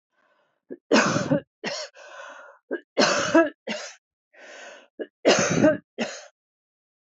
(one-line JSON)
{"three_cough_length": "7.1 s", "three_cough_amplitude": 17061, "three_cough_signal_mean_std_ratio": 0.42, "survey_phase": "beta (2021-08-13 to 2022-03-07)", "age": "45-64", "gender": "Female", "wearing_mask": "No", "symptom_none": true, "smoker_status": "Ex-smoker", "respiratory_condition_asthma": false, "respiratory_condition_other": false, "recruitment_source": "REACT", "submission_delay": "1 day", "covid_test_result": "Negative", "covid_test_method": "RT-qPCR", "influenza_a_test_result": "Negative", "influenza_b_test_result": "Negative"}